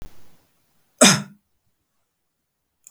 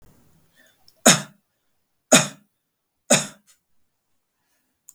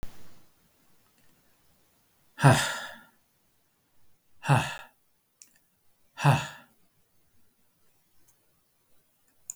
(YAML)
cough_length: 2.9 s
cough_amplitude: 32768
cough_signal_mean_std_ratio: 0.22
three_cough_length: 4.9 s
three_cough_amplitude: 32768
three_cough_signal_mean_std_ratio: 0.21
exhalation_length: 9.6 s
exhalation_amplitude: 20924
exhalation_signal_mean_std_ratio: 0.25
survey_phase: beta (2021-08-13 to 2022-03-07)
age: 45-64
gender: Male
wearing_mask: 'No'
symptom_none: true
smoker_status: Never smoked
respiratory_condition_asthma: false
respiratory_condition_other: false
recruitment_source: REACT
submission_delay: 2 days
covid_test_result: Negative
covid_test_method: RT-qPCR
influenza_a_test_result: Negative
influenza_b_test_result: Negative